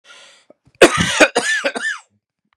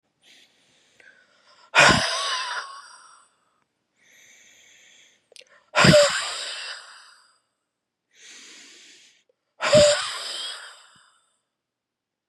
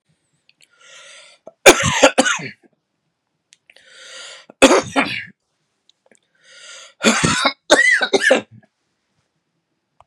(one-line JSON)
{"cough_length": "2.6 s", "cough_amplitude": 32768, "cough_signal_mean_std_ratio": 0.42, "exhalation_length": "12.3 s", "exhalation_amplitude": 26189, "exhalation_signal_mean_std_ratio": 0.32, "three_cough_length": "10.1 s", "three_cough_amplitude": 32768, "three_cough_signal_mean_std_ratio": 0.35, "survey_phase": "beta (2021-08-13 to 2022-03-07)", "age": "18-44", "gender": "Male", "wearing_mask": "No", "symptom_cough_any": true, "symptom_new_continuous_cough": true, "symptom_runny_or_blocked_nose": true, "symptom_sore_throat": true, "symptom_diarrhoea": true, "symptom_fatigue": true, "symptom_fever_high_temperature": true, "symptom_headache": true, "symptom_other": true, "symptom_onset": "3 days", "smoker_status": "Never smoked", "respiratory_condition_asthma": true, "respiratory_condition_other": false, "recruitment_source": "Test and Trace", "submission_delay": "2 days", "covid_test_result": "Positive", "covid_test_method": "RT-qPCR", "covid_ct_value": 27.0, "covid_ct_gene": "N gene", "covid_ct_mean": 27.0, "covid_viral_load": "1400 copies/ml", "covid_viral_load_category": "Minimal viral load (< 10K copies/ml)"}